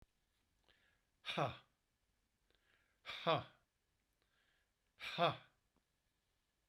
{
  "exhalation_length": "6.7 s",
  "exhalation_amplitude": 2752,
  "exhalation_signal_mean_std_ratio": 0.26,
  "survey_phase": "beta (2021-08-13 to 2022-03-07)",
  "age": "65+",
  "gender": "Male",
  "wearing_mask": "No",
  "symptom_none": true,
  "smoker_status": "Never smoked",
  "respiratory_condition_asthma": false,
  "respiratory_condition_other": false,
  "recruitment_source": "REACT",
  "submission_delay": "2 days",
  "covid_test_result": "Negative",
  "covid_test_method": "RT-qPCR"
}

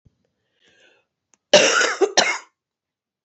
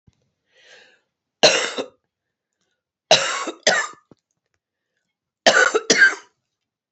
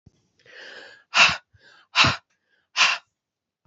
{
  "cough_length": "3.2 s",
  "cough_amplitude": 28676,
  "cough_signal_mean_std_ratio": 0.35,
  "three_cough_length": "6.9 s",
  "three_cough_amplitude": 31704,
  "three_cough_signal_mean_std_ratio": 0.33,
  "exhalation_length": "3.7 s",
  "exhalation_amplitude": 26547,
  "exhalation_signal_mean_std_ratio": 0.32,
  "survey_phase": "alpha (2021-03-01 to 2021-08-12)",
  "age": "45-64",
  "gender": "Female",
  "wearing_mask": "No",
  "symptom_cough_any": true,
  "symptom_change_to_sense_of_smell_or_taste": true,
  "symptom_loss_of_taste": true,
  "symptom_onset": "7 days",
  "smoker_status": "Current smoker (1 to 10 cigarettes per day)",
  "respiratory_condition_asthma": false,
  "respiratory_condition_other": false,
  "recruitment_source": "Test and Trace",
  "submission_delay": "2 days",
  "covid_test_result": "Positive",
  "covid_test_method": "RT-qPCR",
  "covid_ct_value": 22.9,
  "covid_ct_gene": "N gene",
  "covid_ct_mean": 23.3,
  "covid_viral_load": "22000 copies/ml",
  "covid_viral_load_category": "Low viral load (10K-1M copies/ml)"
}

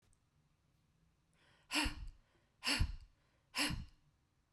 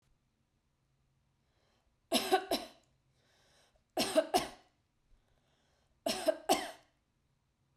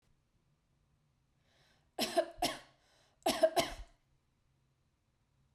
{
  "exhalation_length": "4.5 s",
  "exhalation_amplitude": 2765,
  "exhalation_signal_mean_std_ratio": 0.37,
  "three_cough_length": "7.8 s",
  "three_cough_amplitude": 6113,
  "three_cough_signal_mean_std_ratio": 0.3,
  "cough_length": "5.5 s",
  "cough_amplitude": 4996,
  "cough_signal_mean_std_ratio": 0.28,
  "survey_phase": "beta (2021-08-13 to 2022-03-07)",
  "age": "45-64",
  "gender": "Female",
  "wearing_mask": "No",
  "symptom_none": true,
  "smoker_status": "Never smoked",
  "respiratory_condition_asthma": false,
  "respiratory_condition_other": false,
  "recruitment_source": "REACT",
  "submission_delay": "2 days",
  "covid_test_result": "Negative",
  "covid_test_method": "RT-qPCR",
  "influenza_a_test_result": "Negative",
  "influenza_b_test_result": "Negative"
}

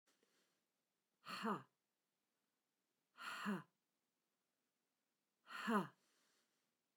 {
  "exhalation_length": "7.0 s",
  "exhalation_amplitude": 1654,
  "exhalation_signal_mean_std_ratio": 0.29,
  "survey_phase": "beta (2021-08-13 to 2022-03-07)",
  "age": "65+",
  "gender": "Female",
  "wearing_mask": "No",
  "symptom_none": true,
  "symptom_onset": "13 days",
  "smoker_status": "Ex-smoker",
  "respiratory_condition_asthma": true,
  "respiratory_condition_other": false,
  "recruitment_source": "REACT",
  "submission_delay": "1 day",
  "covid_test_result": "Negative",
  "covid_test_method": "RT-qPCR",
  "influenza_a_test_result": "Unknown/Void",
  "influenza_b_test_result": "Unknown/Void"
}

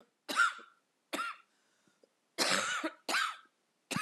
{
  "three_cough_length": "4.0 s",
  "three_cough_amplitude": 5408,
  "three_cough_signal_mean_std_ratio": 0.46,
  "survey_phase": "beta (2021-08-13 to 2022-03-07)",
  "age": "45-64",
  "gender": "Female",
  "wearing_mask": "No",
  "symptom_cough_any": true,
  "symptom_runny_or_blocked_nose": true,
  "symptom_shortness_of_breath": true,
  "symptom_diarrhoea": true,
  "symptom_fatigue": true,
  "symptom_fever_high_temperature": true,
  "symptom_headache": true,
  "symptom_other": true,
  "symptom_onset": "5 days",
  "smoker_status": "Never smoked",
  "respiratory_condition_asthma": true,
  "respiratory_condition_other": false,
  "recruitment_source": "Test and Trace",
  "submission_delay": "2 days",
  "covid_test_result": "Positive",
  "covid_test_method": "RT-qPCR",
  "covid_ct_value": 21.9,
  "covid_ct_gene": "ORF1ab gene",
  "covid_ct_mean": 23.3,
  "covid_viral_load": "23000 copies/ml",
  "covid_viral_load_category": "Low viral load (10K-1M copies/ml)"
}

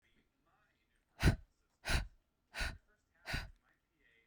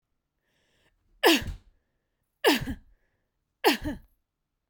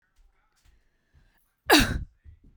{
  "exhalation_length": "4.3 s",
  "exhalation_amplitude": 4862,
  "exhalation_signal_mean_std_ratio": 0.29,
  "three_cough_length": "4.7 s",
  "three_cough_amplitude": 18831,
  "three_cough_signal_mean_std_ratio": 0.29,
  "cough_length": "2.6 s",
  "cough_amplitude": 18337,
  "cough_signal_mean_std_ratio": 0.26,
  "survey_phase": "beta (2021-08-13 to 2022-03-07)",
  "age": "18-44",
  "gender": "Female",
  "wearing_mask": "No",
  "symptom_fatigue": true,
  "symptom_headache": true,
  "symptom_other": true,
  "smoker_status": "Never smoked",
  "respiratory_condition_asthma": false,
  "respiratory_condition_other": false,
  "recruitment_source": "Test and Trace",
  "submission_delay": "2 days",
  "covid_test_result": "Positive",
  "covid_test_method": "RT-qPCR",
  "covid_ct_value": 34.8,
  "covid_ct_gene": "ORF1ab gene"
}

